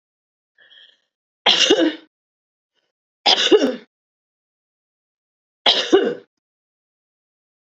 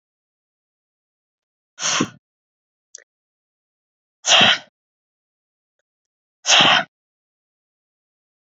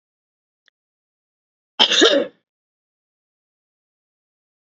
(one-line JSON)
{"three_cough_length": "7.8 s", "three_cough_amplitude": 32768, "three_cough_signal_mean_std_ratio": 0.32, "exhalation_length": "8.4 s", "exhalation_amplitude": 30461, "exhalation_signal_mean_std_ratio": 0.25, "cough_length": "4.6 s", "cough_amplitude": 29407, "cough_signal_mean_std_ratio": 0.24, "survey_phase": "beta (2021-08-13 to 2022-03-07)", "age": "45-64", "gender": "Female", "wearing_mask": "No", "symptom_runny_or_blocked_nose": true, "smoker_status": "Ex-smoker", "respiratory_condition_asthma": false, "respiratory_condition_other": false, "recruitment_source": "Test and Trace", "submission_delay": "2 days", "covid_test_result": "Positive", "covid_test_method": "LFT"}